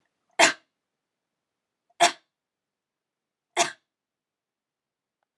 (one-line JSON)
{"three_cough_length": "5.4 s", "three_cough_amplitude": 31006, "three_cough_signal_mean_std_ratio": 0.18, "survey_phase": "beta (2021-08-13 to 2022-03-07)", "age": "18-44", "gender": "Female", "wearing_mask": "No", "symptom_none": true, "smoker_status": "Never smoked", "respiratory_condition_asthma": false, "respiratory_condition_other": false, "recruitment_source": "REACT", "submission_delay": "1 day", "covid_test_result": "Negative", "covid_test_method": "RT-qPCR", "influenza_a_test_result": "Unknown/Void", "influenza_b_test_result": "Unknown/Void"}